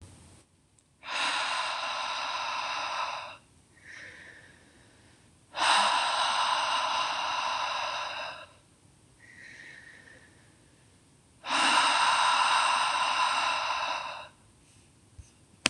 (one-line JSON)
{"exhalation_length": "15.7 s", "exhalation_amplitude": 25715, "exhalation_signal_mean_std_ratio": 0.63, "survey_phase": "beta (2021-08-13 to 2022-03-07)", "age": "18-44", "gender": "Female", "wearing_mask": "No", "symptom_none": true, "smoker_status": "Never smoked", "respiratory_condition_asthma": true, "respiratory_condition_other": false, "recruitment_source": "REACT", "submission_delay": "0 days", "covid_test_result": "Negative", "covid_test_method": "RT-qPCR", "influenza_a_test_result": "Negative", "influenza_b_test_result": "Negative"}